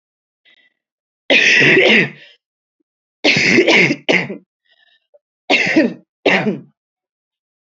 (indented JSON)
{
  "three_cough_length": "7.8 s",
  "three_cough_amplitude": 31277,
  "three_cough_signal_mean_std_ratio": 0.47,
  "survey_phase": "beta (2021-08-13 to 2022-03-07)",
  "age": "18-44",
  "gender": "Female",
  "wearing_mask": "No",
  "symptom_cough_any": true,
  "symptom_new_continuous_cough": true,
  "symptom_runny_or_blocked_nose": true,
  "symptom_sore_throat": true,
  "symptom_fatigue": true,
  "symptom_fever_high_temperature": true,
  "symptom_headache": true,
  "symptom_onset": "2 days",
  "smoker_status": "Ex-smoker",
  "respiratory_condition_asthma": false,
  "respiratory_condition_other": false,
  "recruitment_source": "Test and Trace",
  "submission_delay": "1 day",
  "covid_test_result": "Positive",
  "covid_test_method": "RT-qPCR",
  "covid_ct_value": 19.2,
  "covid_ct_gene": "ORF1ab gene"
}